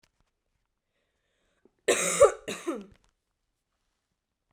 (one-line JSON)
{"cough_length": "4.5 s", "cough_amplitude": 15934, "cough_signal_mean_std_ratio": 0.24, "survey_phase": "beta (2021-08-13 to 2022-03-07)", "age": "18-44", "gender": "Female", "wearing_mask": "No", "symptom_new_continuous_cough": true, "symptom_sore_throat": true, "symptom_fever_high_temperature": true, "smoker_status": "Never smoked", "respiratory_condition_asthma": false, "respiratory_condition_other": false, "recruitment_source": "Test and Trace", "submission_delay": "2 days", "covid_test_result": "Positive", "covid_test_method": "ePCR"}